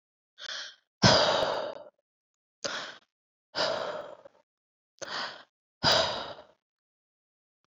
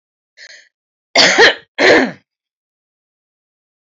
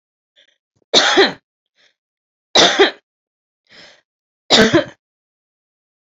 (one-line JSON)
{"exhalation_length": "7.7 s", "exhalation_amplitude": 17971, "exhalation_signal_mean_std_ratio": 0.38, "cough_length": "3.8 s", "cough_amplitude": 30942, "cough_signal_mean_std_ratio": 0.35, "three_cough_length": "6.1 s", "three_cough_amplitude": 32213, "three_cough_signal_mean_std_ratio": 0.33, "survey_phase": "beta (2021-08-13 to 2022-03-07)", "age": "45-64", "gender": "Female", "wearing_mask": "No", "symptom_cough_any": true, "symptom_runny_or_blocked_nose": true, "symptom_onset": "10 days", "smoker_status": "Ex-smoker", "respiratory_condition_asthma": false, "respiratory_condition_other": false, "recruitment_source": "REACT", "submission_delay": "0 days", "covid_test_result": "Negative", "covid_test_method": "RT-qPCR"}